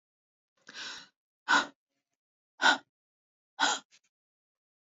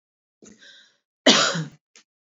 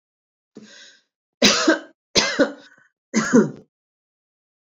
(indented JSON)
{
  "exhalation_length": "4.9 s",
  "exhalation_amplitude": 10375,
  "exhalation_signal_mean_std_ratio": 0.26,
  "cough_length": "2.3 s",
  "cough_amplitude": 27545,
  "cough_signal_mean_std_ratio": 0.3,
  "three_cough_length": "4.7 s",
  "three_cough_amplitude": 30502,
  "three_cough_signal_mean_std_ratio": 0.35,
  "survey_phase": "beta (2021-08-13 to 2022-03-07)",
  "age": "65+",
  "gender": "Female",
  "wearing_mask": "No",
  "symptom_none": true,
  "smoker_status": "Never smoked",
  "respiratory_condition_asthma": false,
  "respiratory_condition_other": false,
  "recruitment_source": "REACT",
  "submission_delay": "1 day",
  "covid_test_result": "Negative",
  "covid_test_method": "RT-qPCR"
}